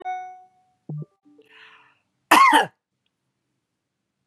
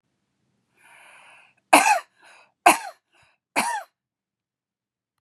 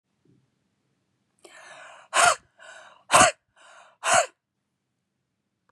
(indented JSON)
{
  "cough_length": "4.3 s",
  "cough_amplitude": 29507,
  "cough_signal_mean_std_ratio": 0.28,
  "three_cough_length": "5.2 s",
  "three_cough_amplitude": 32767,
  "three_cough_signal_mean_std_ratio": 0.25,
  "exhalation_length": "5.7 s",
  "exhalation_amplitude": 23846,
  "exhalation_signal_mean_std_ratio": 0.27,
  "survey_phase": "beta (2021-08-13 to 2022-03-07)",
  "age": "45-64",
  "gender": "Female",
  "wearing_mask": "No",
  "symptom_none": true,
  "symptom_onset": "12 days",
  "smoker_status": "Ex-smoker",
  "respiratory_condition_asthma": false,
  "respiratory_condition_other": false,
  "recruitment_source": "REACT",
  "submission_delay": "1 day",
  "covid_test_result": "Negative",
  "covid_test_method": "RT-qPCR",
  "influenza_a_test_result": "Negative",
  "influenza_b_test_result": "Negative"
}